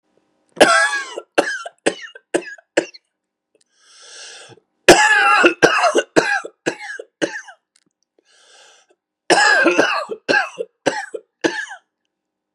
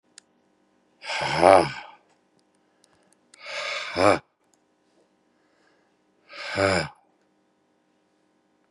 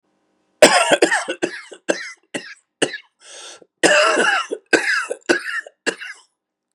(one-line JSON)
{"three_cough_length": "12.5 s", "three_cough_amplitude": 32768, "three_cough_signal_mean_std_ratio": 0.42, "exhalation_length": "8.7 s", "exhalation_amplitude": 29976, "exhalation_signal_mean_std_ratio": 0.28, "cough_length": "6.7 s", "cough_amplitude": 32768, "cough_signal_mean_std_ratio": 0.45, "survey_phase": "beta (2021-08-13 to 2022-03-07)", "age": "18-44", "gender": "Male", "wearing_mask": "No", "symptom_none": true, "symptom_onset": "12 days", "smoker_status": "Never smoked", "respiratory_condition_asthma": false, "respiratory_condition_other": true, "recruitment_source": "REACT", "submission_delay": "1 day", "covid_test_result": "Negative", "covid_test_method": "RT-qPCR", "influenza_a_test_result": "Negative", "influenza_b_test_result": "Negative"}